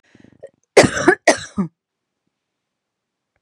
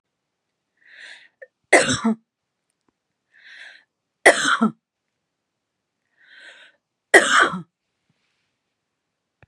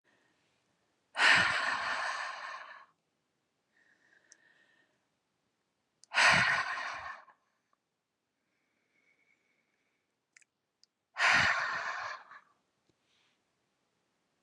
{
  "cough_length": "3.4 s",
  "cough_amplitude": 32768,
  "cough_signal_mean_std_ratio": 0.27,
  "three_cough_length": "9.5 s",
  "three_cough_amplitude": 32768,
  "three_cough_signal_mean_std_ratio": 0.26,
  "exhalation_length": "14.4 s",
  "exhalation_amplitude": 9096,
  "exhalation_signal_mean_std_ratio": 0.34,
  "survey_phase": "beta (2021-08-13 to 2022-03-07)",
  "age": "45-64",
  "gender": "Female",
  "wearing_mask": "No",
  "symptom_none": true,
  "smoker_status": "Never smoked",
  "respiratory_condition_asthma": false,
  "respiratory_condition_other": false,
  "recruitment_source": "REACT",
  "submission_delay": "2 days",
  "covid_test_result": "Negative",
  "covid_test_method": "RT-qPCR",
  "influenza_a_test_result": "Negative",
  "influenza_b_test_result": "Negative"
}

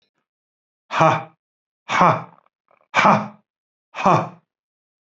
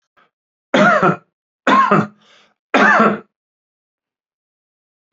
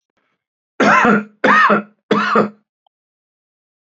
{
  "exhalation_length": "5.1 s",
  "exhalation_amplitude": 32768,
  "exhalation_signal_mean_std_ratio": 0.35,
  "three_cough_length": "5.1 s",
  "three_cough_amplitude": 31547,
  "three_cough_signal_mean_std_ratio": 0.41,
  "cough_length": "3.8 s",
  "cough_amplitude": 29151,
  "cough_signal_mean_std_ratio": 0.47,
  "survey_phase": "beta (2021-08-13 to 2022-03-07)",
  "age": "65+",
  "gender": "Male",
  "wearing_mask": "No",
  "symptom_none": true,
  "smoker_status": "Ex-smoker",
  "respiratory_condition_asthma": false,
  "respiratory_condition_other": false,
  "recruitment_source": "REACT",
  "submission_delay": "2 days",
  "covid_test_result": "Negative",
  "covid_test_method": "RT-qPCR",
  "influenza_a_test_result": "Negative",
  "influenza_b_test_result": "Negative"
}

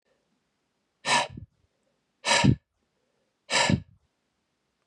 {
  "exhalation_length": "4.9 s",
  "exhalation_amplitude": 15264,
  "exhalation_signal_mean_std_ratio": 0.32,
  "survey_phase": "beta (2021-08-13 to 2022-03-07)",
  "age": "18-44",
  "gender": "Male",
  "wearing_mask": "No",
  "symptom_cough_any": true,
  "symptom_runny_or_blocked_nose": true,
  "symptom_sore_throat": true,
  "symptom_onset": "3 days",
  "smoker_status": "Never smoked",
  "respiratory_condition_asthma": false,
  "respiratory_condition_other": false,
  "recruitment_source": "Test and Trace",
  "submission_delay": "1 day",
  "covid_test_result": "Positive",
  "covid_test_method": "ePCR"
}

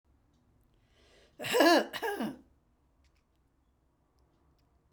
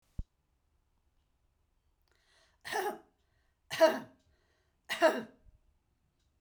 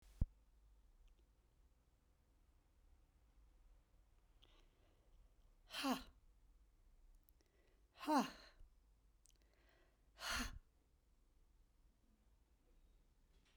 {
  "cough_length": "4.9 s",
  "cough_amplitude": 8797,
  "cough_signal_mean_std_ratio": 0.28,
  "three_cough_length": "6.4 s",
  "three_cough_amplitude": 7272,
  "three_cough_signal_mean_std_ratio": 0.25,
  "exhalation_length": "13.6 s",
  "exhalation_amplitude": 2048,
  "exhalation_signal_mean_std_ratio": 0.27,
  "survey_phase": "beta (2021-08-13 to 2022-03-07)",
  "age": "65+",
  "gender": "Female",
  "wearing_mask": "No",
  "symptom_none": true,
  "smoker_status": "Ex-smoker",
  "respiratory_condition_asthma": false,
  "respiratory_condition_other": false,
  "recruitment_source": "REACT",
  "submission_delay": "2 days",
  "covid_test_result": "Negative",
  "covid_test_method": "RT-qPCR"
}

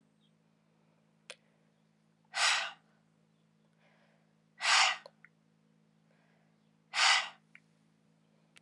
{
  "exhalation_length": "8.6 s",
  "exhalation_amplitude": 7836,
  "exhalation_signal_mean_std_ratio": 0.28,
  "survey_phase": "alpha (2021-03-01 to 2021-08-12)",
  "age": "45-64",
  "gender": "Female",
  "wearing_mask": "No",
  "symptom_cough_any": true,
  "symptom_fatigue": true,
  "smoker_status": "Never smoked",
  "respiratory_condition_asthma": false,
  "respiratory_condition_other": false,
  "recruitment_source": "Test and Trace",
  "submission_delay": "2 days",
  "covid_ct_value": 22.9,
  "covid_ct_gene": "ORF1ab gene"
}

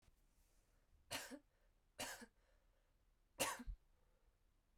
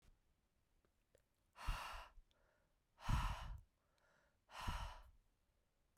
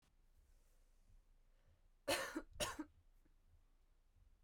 {
  "three_cough_length": "4.8 s",
  "three_cough_amplitude": 1348,
  "three_cough_signal_mean_std_ratio": 0.35,
  "exhalation_length": "6.0 s",
  "exhalation_amplitude": 1267,
  "exhalation_signal_mean_std_ratio": 0.37,
  "cough_length": "4.4 s",
  "cough_amplitude": 1775,
  "cough_signal_mean_std_ratio": 0.35,
  "survey_phase": "alpha (2021-03-01 to 2021-08-12)",
  "age": "18-44",
  "gender": "Female",
  "wearing_mask": "No",
  "symptom_change_to_sense_of_smell_or_taste": true,
  "symptom_loss_of_taste": true,
  "symptom_onset": "2 days",
  "smoker_status": "Ex-smoker",
  "respiratory_condition_asthma": false,
  "respiratory_condition_other": false,
  "recruitment_source": "Test and Trace",
  "submission_delay": "1 day",
  "covid_test_result": "Positive",
  "covid_test_method": "RT-qPCR",
  "covid_ct_value": 12.8,
  "covid_ct_gene": "ORF1ab gene",
  "covid_ct_mean": 13.3,
  "covid_viral_load": "44000000 copies/ml",
  "covid_viral_load_category": "High viral load (>1M copies/ml)"
}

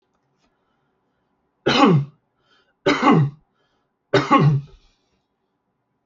{
  "three_cough_length": "6.1 s",
  "three_cough_amplitude": 26682,
  "three_cough_signal_mean_std_ratio": 0.38,
  "survey_phase": "alpha (2021-03-01 to 2021-08-12)",
  "age": "45-64",
  "gender": "Male",
  "wearing_mask": "No",
  "symptom_fatigue": true,
  "smoker_status": "Ex-smoker",
  "respiratory_condition_asthma": false,
  "respiratory_condition_other": false,
  "recruitment_source": "REACT",
  "submission_delay": "2 days",
  "covid_test_result": "Negative",
  "covid_test_method": "RT-qPCR"
}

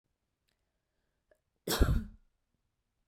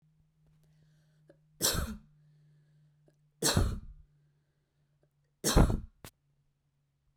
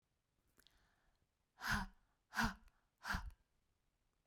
{
  "cough_length": "3.1 s",
  "cough_amplitude": 8646,
  "cough_signal_mean_std_ratio": 0.25,
  "three_cough_length": "7.2 s",
  "three_cough_amplitude": 9229,
  "three_cough_signal_mean_std_ratio": 0.29,
  "exhalation_length": "4.3 s",
  "exhalation_amplitude": 1645,
  "exhalation_signal_mean_std_ratio": 0.32,
  "survey_phase": "beta (2021-08-13 to 2022-03-07)",
  "age": "45-64",
  "gender": "Female",
  "wearing_mask": "No",
  "symptom_none": true,
  "smoker_status": "Never smoked",
  "respiratory_condition_asthma": false,
  "respiratory_condition_other": false,
  "recruitment_source": "REACT",
  "submission_delay": "1 day",
  "covid_test_result": "Negative",
  "covid_test_method": "RT-qPCR"
}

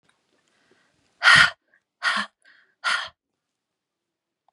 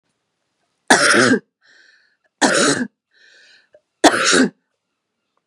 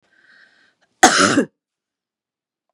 {
  "exhalation_length": "4.5 s",
  "exhalation_amplitude": 31379,
  "exhalation_signal_mean_std_ratio": 0.27,
  "three_cough_length": "5.5 s",
  "three_cough_amplitude": 32768,
  "three_cough_signal_mean_std_ratio": 0.4,
  "cough_length": "2.7 s",
  "cough_amplitude": 32768,
  "cough_signal_mean_std_ratio": 0.29,
  "survey_phase": "beta (2021-08-13 to 2022-03-07)",
  "age": "45-64",
  "gender": "Female",
  "wearing_mask": "No",
  "symptom_none": true,
  "smoker_status": "Ex-smoker",
  "respiratory_condition_asthma": false,
  "respiratory_condition_other": false,
  "recruitment_source": "REACT",
  "submission_delay": "1 day",
  "covid_test_result": "Negative",
  "covid_test_method": "RT-qPCR",
  "influenza_a_test_result": "Negative",
  "influenza_b_test_result": "Negative"
}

